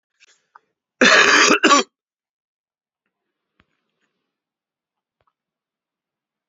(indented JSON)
{
  "cough_length": "6.5 s",
  "cough_amplitude": 32767,
  "cough_signal_mean_std_ratio": 0.27,
  "survey_phase": "beta (2021-08-13 to 2022-03-07)",
  "age": "18-44",
  "gender": "Male",
  "wearing_mask": "No",
  "symptom_cough_any": true,
  "symptom_new_continuous_cough": true,
  "symptom_runny_or_blocked_nose": true,
  "symptom_shortness_of_breath": true,
  "symptom_sore_throat": true,
  "symptom_diarrhoea": true,
  "symptom_fatigue": true,
  "symptom_fever_high_temperature": true,
  "symptom_headache": true,
  "symptom_change_to_sense_of_smell_or_taste": true,
  "symptom_loss_of_taste": true,
  "smoker_status": "Never smoked",
  "respiratory_condition_asthma": false,
  "respiratory_condition_other": false,
  "recruitment_source": "Test and Trace",
  "submission_delay": "2 days",
  "covid_test_result": "Positive",
  "covid_test_method": "LFT"
}